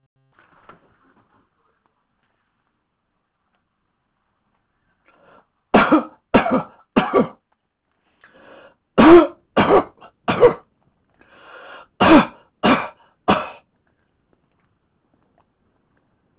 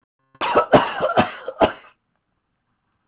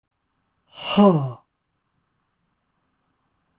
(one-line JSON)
{"three_cough_length": "16.4 s", "three_cough_amplitude": 32768, "three_cough_signal_mean_std_ratio": 0.28, "cough_length": "3.1 s", "cough_amplitude": 29273, "cough_signal_mean_std_ratio": 0.4, "exhalation_length": "3.6 s", "exhalation_amplitude": 22015, "exhalation_signal_mean_std_ratio": 0.26, "survey_phase": "beta (2021-08-13 to 2022-03-07)", "age": "65+", "gender": "Male", "wearing_mask": "No", "symptom_fatigue": true, "symptom_onset": "12 days", "smoker_status": "Never smoked", "respiratory_condition_asthma": false, "respiratory_condition_other": false, "recruitment_source": "REACT", "submission_delay": "1 day", "covid_test_result": "Negative", "covid_test_method": "RT-qPCR"}